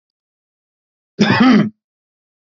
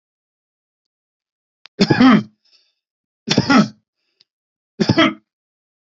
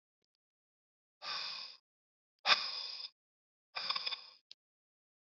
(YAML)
cough_length: 2.5 s
cough_amplitude: 32592
cough_signal_mean_std_ratio: 0.36
three_cough_length: 5.8 s
three_cough_amplitude: 28405
three_cough_signal_mean_std_ratio: 0.32
exhalation_length: 5.2 s
exhalation_amplitude: 8044
exhalation_signal_mean_std_ratio: 0.32
survey_phase: beta (2021-08-13 to 2022-03-07)
age: 45-64
gender: Male
wearing_mask: 'No'
symptom_none: true
smoker_status: Never smoked
respiratory_condition_asthma: false
respiratory_condition_other: false
recruitment_source: REACT
submission_delay: 1 day
covid_test_result: Negative
covid_test_method: RT-qPCR
influenza_a_test_result: Negative
influenza_b_test_result: Negative